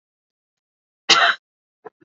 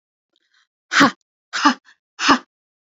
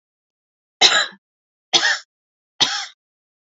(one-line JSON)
{"cough_length": "2.0 s", "cough_amplitude": 29558, "cough_signal_mean_std_ratio": 0.27, "exhalation_length": "2.9 s", "exhalation_amplitude": 31626, "exhalation_signal_mean_std_ratio": 0.32, "three_cough_length": "3.6 s", "three_cough_amplitude": 32768, "three_cough_signal_mean_std_ratio": 0.33, "survey_phase": "beta (2021-08-13 to 2022-03-07)", "age": "18-44", "gender": "Female", "wearing_mask": "No", "symptom_sore_throat": true, "symptom_onset": "13 days", "smoker_status": "Never smoked", "respiratory_condition_asthma": true, "respiratory_condition_other": false, "recruitment_source": "REACT", "submission_delay": "0 days", "covid_test_result": "Negative", "covid_test_method": "RT-qPCR", "influenza_a_test_result": "Negative", "influenza_b_test_result": "Negative"}